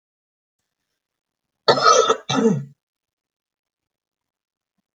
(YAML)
cough_length: 4.9 s
cough_amplitude: 28699
cough_signal_mean_std_ratio: 0.3
survey_phase: beta (2021-08-13 to 2022-03-07)
age: 45-64
gender: Female
wearing_mask: 'No'
symptom_change_to_sense_of_smell_or_taste: true
symptom_loss_of_taste: true
smoker_status: Never smoked
respiratory_condition_asthma: false
respiratory_condition_other: false
recruitment_source: REACT
submission_delay: 2 days
covid_test_result: Negative
covid_test_method: RT-qPCR